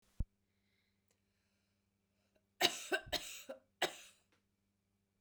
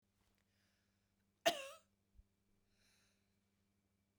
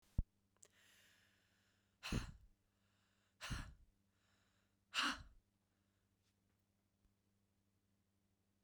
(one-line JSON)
{"three_cough_length": "5.2 s", "three_cough_amplitude": 5475, "three_cough_signal_mean_std_ratio": 0.25, "cough_length": "4.2 s", "cough_amplitude": 2986, "cough_signal_mean_std_ratio": 0.15, "exhalation_length": "8.6 s", "exhalation_amplitude": 2003, "exhalation_signal_mean_std_ratio": 0.24, "survey_phase": "beta (2021-08-13 to 2022-03-07)", "age": "18-44", "gender": "Female", "wearing_mask": "No", "symptom_none": true, "smoker_status": "Ex-smoker", "respiratory_condition_asthma": true, "respiratory_condition_other": false, "recruitment_source": "REACT", "submission_delay": "2 days", "covid_test_result": "Negative", "covid_test_method": "RT-qPCR", "influenza_a_test_result": "Negative", "influenza_b_test_result": "Negative"}